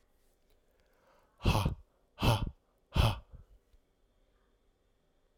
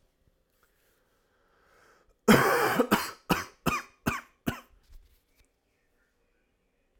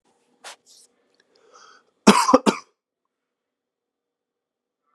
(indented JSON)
{
  "exhalation_length": "5.4 s",
  "exhalation_amplitude": 6541,
  "exhalation_signal_mean_std_ratio": 0.31,
  "three_cough_length": "7.0 s",
  "three_cough_amplitude": 19795,
  "three_cough_signal_mean_std_ratio": 0.3,
  "cough_length": "4.9 s",
  "cough_amplitude": 32768,
  "cough_signal_mean_std_ratio": 0.2,
  "survey_phase": "alpha (2021-03-01 to 2021-08-12)",
  "age": "18-44",
  "gender": "Male",
  "wearing_mask": "No",
  "symptom_cough_any": true,
  "symptom_fatigue": true,
  "symptom_headache": true,
  "symptom_change_to_sense_of_smell_or_taste": true,
  "symptom_loss_of_taste": true,
  "symptom_onset": "2 days",
  "smoker_status": "Never smoked",
  "respiratory_condition_asthma": false,
  "respiratory_condition_other": false,
  "recruitment_source": "Test and Trace",
  "submission_delay": "2 days",
  "covid_test_result": "Positive",
  "covid_test_method": "RT-qPCR"
}